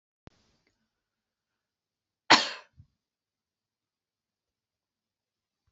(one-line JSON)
{"cough_length": "5.7 s", "cough_amplitude": 25195, "cough_signal_mean_std_ratio": 0.12, "survey_phase": "beta (2021-08-13 to 2022-03-07)", "age": "45-64", "gender": "Female", "wearing_mask": "No", "symptom_none": true, "symptom_onset": "7 days", "smoker_status": "Never smoked", "respiratory_condition_asthma": true, "respiratory_condition_other": false, "recruitment_source": "REACT", "submission_delay": "4 days", "covid_test_result": "Negative", "covid_test_method": "RT-qPCR", "influenza_a_test_result": "Negative", "influenza_b_test_result": "Negative"}